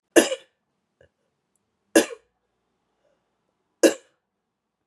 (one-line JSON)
{"three_cough_length": "4.9 s", "three_cough_amplitude": 31541, "three_cough_signal_mean_std_ratio": 0.19, "survey_phase": "beta (2021-08-13 to 2022-03-07)", "age": "18-44", "gender": "Female", "wearing_mask": "No", "symptom_cough_any": true, "symptom_runny_or_blocked_nose": true, "symptom_onset": "8 days", "smoker_status": "Never smoked", "respiratory_condition_asthma": false, "respiratory_condition_other": false, "recruitment_source": "Test and Trace", "submission_delay": "2 days", "covid_test_result": "Positive", "covid_test_method": "RT-qPCR", "covid_ct_value": 14.0, "covid_ct_gene": "ORF1ab gene"}